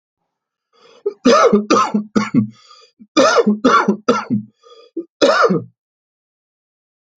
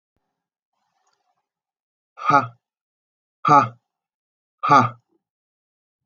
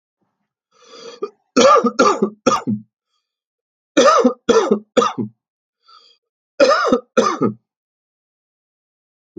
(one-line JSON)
{"cough_length": "7.2 s", "cough_amplitude": 31020, "cough_signal_mean_std_ratio": 0.48, "exhalation_length": "6.1 s", "exhalation_amplitude": 28936, "exhalation_signal_mean_std_ratio": 0.25, "three_cough_length": "9.4 s", "three_cough_amplitude": 29345, "three_cough_signal_mean_std_ratio": 0.41, "survey_phase": "alpha (2021-03-01 to 2021-08-12)", "age": "45-64", "gender": "Male", "wearing_mask": "No", "symptom_none": true, "smoker_status": "Never smoked", "respiratory_condition_asthma": false, "respiratory_condition_other": false, "recruitment_source": "REACT", "submission_delay": "6 days", "covid_test_result": "Negative", "covid_test_method": "RT-qPCR"}